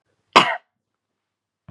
{
  "cough_length": "1.7 s",
  "cough_amplitude": 32767,
  "cough_signal_mean_std_ratio": 0.22,
  "survey_phase": "beta (2021-08-13 to 2022-03-07)",
  "age": "18-44",
  "gender": "Female",
  "wearing_mask": "No",
  "symptom_none": true,
  "symptom_onset": "12 days",
  "smoker_status": "Never smoked",
  "respiratory_condition_asthma": false,
  "respiratory_condition_other": false,
  "recruitment_source": "REACT",
  "submission_delay": "1 day",
  "covid_test_result": "Negative",
  "covid_test_method": "RT-qPCR",
  "influenza_a_test_result": "Negative",
  "influenza_b_test_result": "Negative"
}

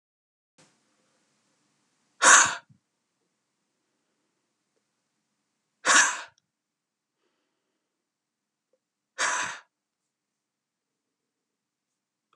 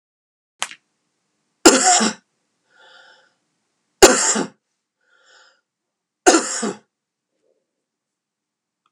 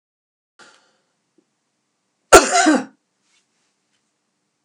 {
  "exhalation_length": "12.4 s",
  "exhalation_amplitude": 26455,
  "exhalation_signal_mean_std_ratio": 0.19,
  "three_cough_length": "8.9 s",
  "three_cough_amplitude": 32768,
  "three_cough_signal_mean_std_ratio": 0.26,
  "cough_length": "4.6 s",
  "cough_amplitude": 32768,
  "cough_signal_mean_std_ratio": 0.22,
  "survey_phase": "beta (2021-08-13 to 2022-03-07)",
  "age": "65+",
  "gender": "Female",
  "wearing_mask": "No",
  "symptom_prefer_not_to_say": true,
  "symptom_onset": "12 days",
  "smoker_status": "Never smoked",
  "respiratory_condition_asthma": true,
  "respiratory_condition_other": false,
  "recruitment_source": "REACT",
  "submission_delay": "3 days",
  "covid_test_result": "Negative",
  "covid_test_method": "RT-qPCR",
  "influenza_a_test_result": "Negative",
  "influenza_b_test_result": "Negative"
}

